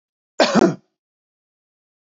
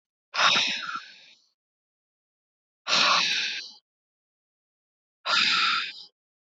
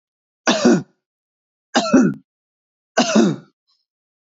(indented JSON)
{
  "cough_length": "2.0 s",
  "cough_amplitude": 25863,
  "cough_signal_mean_std_ratio": 0.29,
  "exhalation_length": "6.5 s",
  "exhalation_amplitude": 14549,
  "exhalation_signal_mean_std_ratio": 0.46,
  "three_cough_length": "4.4 s",
  "three_cough_amplitude": 27176,
  "three_cough_signal_mean_std_ratio": 0.4,
  "survey_phase": "beta (2021-08-13 to 2022-03-07)",
  "age": "18-44",
  "gender": "Male",
  "wearing_mask": "No",
  "symptom_none": true,
  "smoker_status": "Never smoked",
  "respiratory_condition_asthma": false,
  "respiratory_condition_other": false,
  "recruitment_source": "REACT",
  "submission_delay": "1 day",
  "covid_test_result": "Negative",
  "covid_test_method": "RT-qPCR",
  "influenza_a_test_result": "Negative",
  "influenza_b_test_result": "Negative"
}